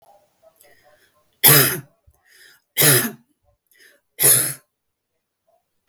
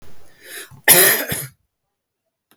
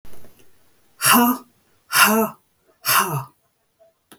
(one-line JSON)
{"three_cough_length": "5.9 s", "three_cough_amplitude": 32768, "three_cough_signal_mean_std_ratio": 0.31, "cough_length": "2.6 s", "cough_amplitude": 32768, "cough_signal_mean_std_ratio": 0.37, "exhalation_length": "4.2 s", "exhalation_amplitude": 32766, "exhalation_signal_mean_std_ratio": 0.44, "survey_phase": "beta (2021-08-13 to 2022-03-07)", "age": "45-64", "gender": "Female", "wearing_mask": "No", "symptom_none": true, "smoker_status": "Never smoked", "respiratory_condition_asthma": false, "respiratory_condition_other": false, "recruitment_source": "REACT", "submission_delay": "5 days", "covid_test_result": "Negative", "covid_test_method": "RT-qPCR"}